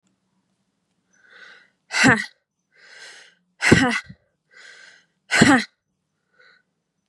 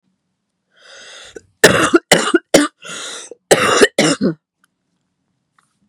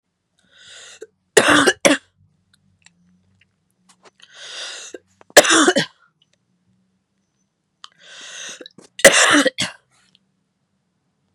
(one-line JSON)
{"exhalation_length": "7.1 s", "exhalation_amplitude": 32768, "exhalation_signal_mean_std_ratio": 0.29, "cough_length": "5.9 s", "cough_amplitude": 32768, "cough_signal_mean_std_ratio": 0.38, "three_cough_length": "11.3 s", "three_cough_amplitude": 32768, "three_cough_signal_mean_std_ratio": 0.28, "survey_phase": "beta (2021-08-13 to 2022-03-07)", "age": "18-44", "gender": "Female", "wearing_mask": "No", "symptom_cough_any": true, "symptom_runny_or_blocked_nose": true, "symptom_sore_throat": true, "symptom_fatigue": true, "symptom_change_to_sense_of_smell_or_taste": true, "smoker_status": "Never smoked", "respiratory_condition_asthma": true, "respiratory_condition_other": true, "recruitment_source": "Test and Trace", "submission_delay": "2 days", "covid_test_result": "Positive", "covid_test_method": "LFT"}